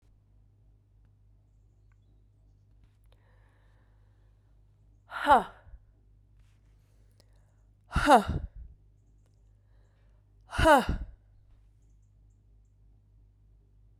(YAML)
exhalation_length: 14.0 s
exhalation_amplitude: 15776
exhalation_signal_mean_std_ratio: 0.23
survey_phase: beta (2021-08-13 to 2022-03-07)
age: 45-64
gender: Female
wearing_mask: 'No'
symptom_cough_any: true
symptom_runny_or_blocked_nose: true
symptom_fatigue: true
symptom_headache: true
symptom_change_to_sense_of_smell_or_taste: true
symptom_other: true
smoker_status: Ex-smoker
respiratory_condition_asthma: false
respiratory_condition_other: false
recruitment_source: Test and Trace
submission_delay: 2 days
covid_test_result: Positive
covid_test_method: RT-qPCR
covid_ct_value: 20.4
covid_ct_gene: ORF1ab gene
covid_ct_mean: 21.1
covid_viral_load: 120000 copies/ml
covid_viral_load_category: Low viral load (10K-1M copies/ml)